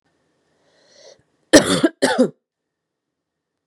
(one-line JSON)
{"cough_length": "3.7 s", "cough_amplitude": 32768, "cough_signal_mean_std_ratio": 0.28, "survey_phase": "beta (2021-08-13 to 2022-03-07)", "age": "18-44", "gender": "Female", "wearing_mask": "No", "symptom_none": true, "symptom_onset": "3 days", "smoker_status": "Never smoked", "respiratory_condition_asthma": false, "respiratory_condition_other": false, "recruitment_source": "Test and Trace", "submission_delay": "2 days", "covid_test_result": "Positive", "covid_test_method": "RT-qPCR", "covid_ct_value": 19.3, "covid_ct_gene": "ORF1ab gene", "covid_ct_mean": 19.8, "covid_viral_load": "330000 copies/ml", "covid_viral_load_category": "Low viral load (10K-1M copies/ml)"}